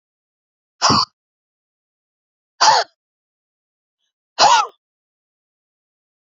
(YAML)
exhalation_length: 6.4 s
exhalation_amplitude: 30202
exhalation_signal_mean_std_ratio: 0.27
survey_phase: beta (2021-08-13 to 2022-03-07)
age: 65+
gender: Female
wearing_mask: 'No'
symptom_none: true
smoker_status: Ex-smoker
respiratory_condition_asthma: true
respiratory_condition_other: false
recruitment_source: Test and Trace
submission_delay: 0 days
covid_test_result: Negative
covid_test_method: LFT